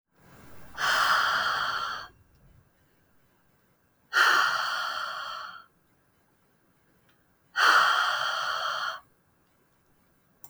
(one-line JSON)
{"exhalation_length": "10.5 s", "exhalation_amplitude": 12807, "exhalation_signal_mean_std_ratio": 0.5, "survey_phase": "beta (2021-08-13 to 2022-03-07)", "age": "18-44", "gender": "Female", "wearing_mask": "No", "symptom_none": true, "symptom_onset": "2 days", "smoker_status": "Ex-smoker", "respiratory_condition_asthma": false, "respiratory_condition_other": false, "recruitment_source": "REACT", "submission_delay": "4 days", "covid_test_result": "Negative", "covid_test_method": "RT-qPCR", "influenza_a_test_result": "Negative", "influenza_b_test_result": "Negative"}